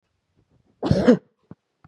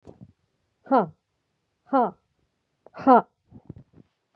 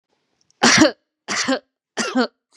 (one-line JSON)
{"cough_length": "1.9 s", "cough_amplitude": 28019, "cough_signal_mean_std_ratio": 0.3, "exhalation_length": "4.4 s", "exhalation_amplitude": 22220, "exhalation_signal_mean_std_ratio": 0.26, "three_cough_length": "2.6 s", "three_cough_amplitude": 32767, "three_cough_signal_mean_std_ratio": 0.43, "survey_phase": "beta (2021-08-13 to 2022-03-07)", "age": "45-64", "gender": "Female", "wearing_mask": "No", "symptom_none": true, "symptom_onset": "5 days", "smoker_status": "Never smoked", "respiratory_condition_asthma": false, "respiratory_condition_other": false, "recruitment_source": "REACT", "submission_delay": "2 days", "covid_test_result": "Negative", "covid_test_method": "RT-qPCR", "influenza_a_test_result": "Negative", "influenza_b_test_result": "Negative"}